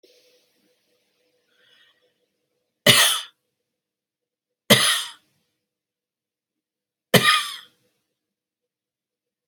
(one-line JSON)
{"three_cough_length": "9.5 s", "three_cough_amplitude": 32768, "three_cough_signal_mean_std_ratio": 0.24, "survey_phase": "alpha (2021-03-01 to 2021-08-12)", "age": "45-64", "gender": "Female", "wearing_mask": "No", "symptom_none": true, "smoker_status": "Never smoked", "respiratory_condition_asthma": false, "respiratory_condition_other": false, "recruitment_source": "REACT", "submission_delay": "2 days", "covid_test_result": "Negative", "covid_test_method": "RT-qPCR"}